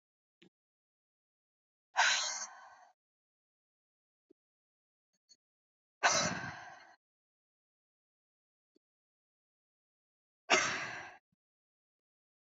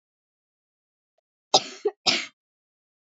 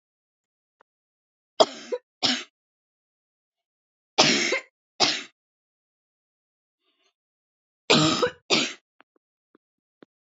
{
  "exhalation_length": "12.5 s",
  "exhalation_amplitude": 7345,
  "exhalation_signal_mean_std_ratio": 0.25,
  "cough_length": "3.1 s",
  "cough_amplitude": 21318,
  "cough_signal_mean_std_ratio": 0.22,
  "three_cough_length": "10.3 s",
  "three_cough_amplitude": 25769,
  "three_cough_signal_mean_std_ratio": 0.28,
  "survey_phase": "beta (2021-08-13 to 2022-03-07)",
  "age": "18-44",
  "gender": "Female",
  "wearing_mask": "No",
  "symptom_cough_any": true,
  "symptom_runny_or_blocked_nose": true,
  "symptom_sore_throat": true,
  "symptom_fatigue": true,
  "symptom_onset": "12 days",
  "smoker_status": "Never smoked",
  "respiratory_condition_asthma": false,
  "respiratory_condition_other": false,
  "recruitment_source": "REACT",
  "submission_delay": "1 day",
  "covid_test_result": "Negative",
  "covid_test_method": "RT-qPCR",
  "influenza_a_test_result": "Unknown/Void",
  "influenza_b_test_result": "Unknown/Void"
}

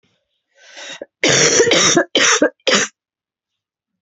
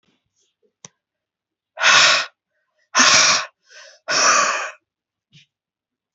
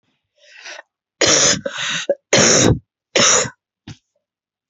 {
  "cough_length": "4.0 s",
  "cough_amplitude": 31851,
  "cough_signal_mean_std_ratio": 0.5,
  "exhalation_length": "6.1 s",
  "exhalation_amplitude": 32767,
  "exhalation_signal_mean_std_ratio": 0.4,
  "three_cough_length": "4.7 s",
  "three_cough_amplitude": 32767,
  "three_cough_signal_mean_std_ratio": 0.47,
  "survey_phase": "alpha (2021-03-01 to 2021-08-12)",
  "age": "45-64",
  "gender": "Female",
  "wearing_mask": "No",
  "symptom_fatigue": true,
  "symptom_headache": true,
  "symptom_change_to_sense_of_smell_or_taste": true,
  "symptom_onset": "2 days",
  "smoker_status": "Ex-smoker",
  "respiratory_condition_asthma": false,
  "respiratory_condition_other": false,
  "recruitment_source": "Test and Trace",
  "submission_delay": "2 days",
  "covid_test_result": "Positive",
  "covid_test_method": "RT-qPCR",
  "covid_ct_value": 16.5,
  "covid_ct_gene": "N gene",
  "covid_ct_mean": 17.4,
  "covid_viral_load": "1900000 copies/ml",
  "covid_viral_load_category": "High viral load (>1M copies/ml)"
}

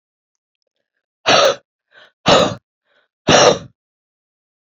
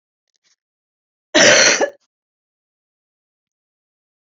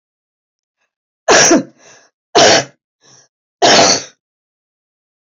{
  "exhalation_length": "4.8 s",
  "exhalation_amplitude": 30300,
  "exhalation_signal_mean_std_ratio": 0.34,
  "cough_length": "4.4 s",
  "cough_amplitude": 32767,
  "cough_signal_mean_std_ratio": 0.28,
  "three_cough_length": "5.2 s",
  "three_cough_amplitude": 32768,
  "three_cough_signal_mean_std_ratio": 0.39,
  "survey_phase": "beta (2021-08-13 to 2022-03-07)",
  "age": "45-64",
  "wearing_mask": "No",
  "symptom_cough_any": true,
  "symptom_runny_or_blocked_nose": true,
  "symptom_onset": "12 days",
  "smoker_status": "Ex-smoker",
  "respiratory_condition_asthma": true,
  "respiratory_condition_other": true,
  "recruitment_source": "REACT",
  "submission_delay": "2 days",
  "covid_test_result": "Negative",
  "covid_test_method": "RT-qPCR",
  "influenza_a_test_result": "Negative",
  "influenza_b_test_result": "Negative"
}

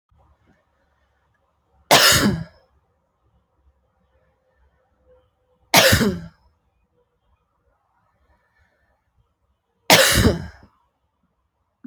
{
  "three_cough_length": "11.9 s",
  "three_cough_amplitude": 32768,
  "three_cough_signal_mean_std_ratio": 0.27,
  "survey_phase": "alpha (2021-03-01 to 2021-08-12)",
  "age": "18-44",
  "gender": "Female",
  "wearing_mask": "No",
  "symptom_cough_any": true,
  "symptom_new_continuous_cough": true,
  "symptom_fever_high_temperature": true,
  "symptom_change_to_sense_of_smell_or_taste": true,
  "symptom_loss_of_taste": true,
  "symptom_onset": "5 days",
  "smoker_status": "Never smoked",
  "respiratory_condition_asthma": false,
  "respiratory_condition_other": false,
  "recruitment_source": "Test and Trace",
  "submission_delay": "2 days",
  "covid_test_result": "Positive",
  "covid_test_method": "RT-qPCR",
  "covid_ct_value": 14.3,
  "covid_ct_gene": "N gene",
  "covid_ct_mean": 14.7,
  "covid_viral_load": "16000000 copies/ml",
  "covid_viral_load_category": "High viral load (>1M copies/ml)"
}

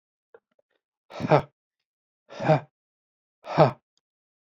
{
  "exhalation_length": "4.5 s",
  "exhalation_amplitude": 20204,
  "exhalation_signal_mean_std_ratio": 0.25,
  "survey_phase": "beta (2021-08-13 to 2022-03-07)",
  "age": "18-44",
  "gender": "Male",
  "wearing_mask": "No",
  "symptom_none": true,
  "symptom_onset": "3 days",
  "smoker_status": "Never smoked",
  "respiratory_condition_asthma": false,
  "respiratory_condition_other": false,
  "recruitment_source": "REACT",
  "submission_delay": "2 days",
  "covid_test_result": "Negative",
  "covid_test_method": "RT-qPCR",
  "influenza_a_test_result": "Negative",
  "influenza_b_test_result": "Negative"
}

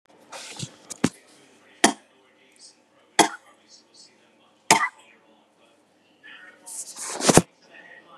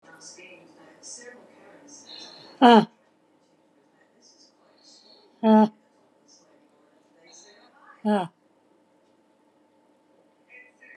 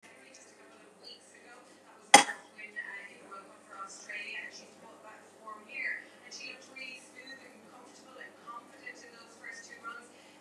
{
  "three_cough_length": "8.2 s",
  "three_cough_amplitude": 32767,
  "three_cough_signal_mean_std_ratio": 0.24,
  "exhalation_length": "11.0 s",
  "exhalation_amplitude": 25390,
  "exhalation_signal_mean_std_ratio": 0.22,
  "cough_length": "10.4 s",
  "cough_amplitude": 29404,
  "cough_signal_mean_std_ratio": 0.25,
  "survey_phase": "beta (2021-08-13 to 2022-03-07)",
  "age": "65+",
  "gender": "Female",
  "wearing_mask": "No",
  "symptom_none": true,
  "smoker_status": "Current smoker (1 to 10 cigarettes per day)",
  "respiratory_condition_asthma": false,
  "respiratory_condition_other": false,
  "recruitment_source": "REACT",
  "submission_delay": "2 days",
  "covid_test_result": "Negative",
  "covid_test_method": "RT-qPCR",
  "influenza_a_test_result": "Negative",
  "influenza_b_test_result": "Negative"
}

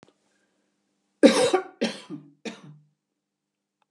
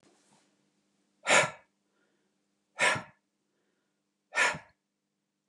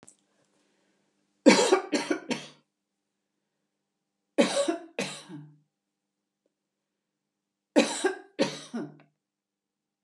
{
  "cough_length": "3.9 s",
  "cough_amplitude": 27466,
  "cough_signal_mean_std_ratio": 0.26,
  "exhalation_length": "5.5 s",
  "exhalation_amplitude": 11635,
  "exhalation_signal_mean_std_ratio": 0.26,
  "three_cough_length": "10.0 s",
  "three_cough_amplitude": 20389,
  "three_cough_signal_mean_std_ratio": 0.29,
  "survey_phase": "beta (2021-08-13 to 2022-03-07)",
  "age": "45-64",
  "gender": "Female",
  "wearing_mask": "No",
  "symptom_cough_any": true,
  "smoker_status": "Never smoked",
  "respiratory_condition_asthma": false,
  "respiratory_condition_other": false,
  "recruitment_source": "REACT",
  "submission_delay": "2 days",
  "covid_test_result": "Negative",
  "covid_test_method": "RT-qPCR",
  "influenza_a_test_result": "Negative",
  "influenza_b_test_result": "Negative"
}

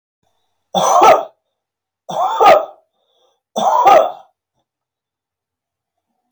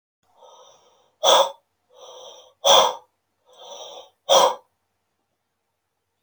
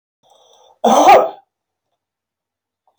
{
  "three_cough_length": "6.3 s",
  "three_cough_amplitude": 32715,
  "three_cough_signal_mean_std_ratio": 0.39,
  "exhalation_length": "6.2 s",
  "exhalation_amplitude": 28706,
  "exhalation_signal_mean_std_ratio": 0.3,
  "cough_length": "3.0 s",
  "cough_amplitude": 32181,
  "cough_signal_mean_std_ratio": 0.32,
  "survey_phase": "beta (2021-08-13 to 2022-03-07)",
  "age": "45-64",
  "gender": "Male",
  "wearing_mask": "No",
  "symptom_none": true,
  "smoker_status": "Never smoked",
  "respiratory_condition_asthma": false,
  "respiratory_condition_other": false,
  "recruitment_source": "REACT",
  "submission_delay": "2 days",
  "covid_test_result": "Negative",
  "covid_test_method": "RT-qPCR"
}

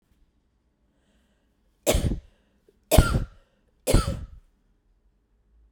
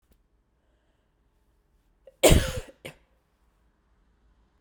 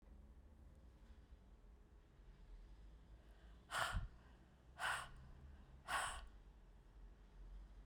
{
  "three_cough_length": "5.7 s",
  "three_cough_amplitude": 28132,
  "three_cough_signal_mean_std_ratio": 0.29,
  "cough_length": "4.6 s",
  "cough_amplitude": 20721,
  "cough_signal_mean_std_ratio": 0.2,
  "exhalation_length": "7.9 s",
  "exhalation_amplitude": 1533,
  "exhalation_signal_mean_std_ratio": 0.56,
  "survey_phase": "beta (2021-08-13 to 2022-03-07)",
  "age": "45-64",
  "gender": "Female",
  "wearing_mask": "No",
  "symptom_cough_any": true,
  "symptom_new_continuous_cough": true,
  "symptom_runny_or_blocked_nose": true,
  "symptom_shortness_of_breath": true,
  "symptom_sore_throat": true,
  "symptom_fatigue": true,
  "symptom_fever_high_temperature": true,
  "symptom_headache": true,
  "symptom_change_to_sense_of_smell_or_taste": true,
  "symptom_loss_of_taste": true,
  "symptom_onset": "4 days",
  "smoker_status": "Never smoked",
  "respiratory_condition_asthma": false,
  "respiratory_condition_other": false,
  "recruitment_source": "Test and Trace",
  "submission_delay": "2 days",
  "covid_test_result": "Positive",
  "covid_test_method": "RT-qPCR",
  "covid_ct_value": 21.0,
  "covid_ct_gene": "ORF1ab gene"
}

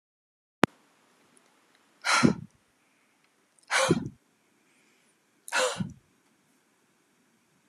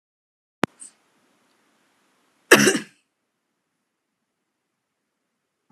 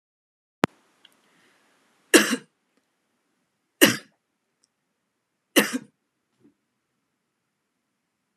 {
  "exhalation_length": "7.7 s",
  "exhalation_amplitude": 31639,
  "exhalation_signal_mean_std_ratio": 0.26,
  "cough_length": "5.7 s",
  "cough_amplitude": 32768,
  "cough_signal_mean_std_ratio": 0.16,
  "three_cough_length": "8.4 s",
  "three_cough_amplitude": 32553,
  "three_cough_signal_mean_std_ratio": 0.17,
  "survey_phase": "beta (2021-08-13 to 2022-03-07)",
  "age": "18-44",
  "gender": "Female",
  "wearing_mask": "No",
  "symptom_runny_or_blocked_nose": true,
  "smoker_status": "Never smoked",
  "respiratory_condition_asthma": true,
  "respiratory_condition_other": false,
  "recruitment_source": "REACT",
  "submission_delay": "1 day",
  "covid_test_result": "Negative",
  "covid_test_method": "RT-qPCR",
  "influenza_a_test_result": "Unknown/Void",
  "influenza_b_test_result": "Unknown/Void"
}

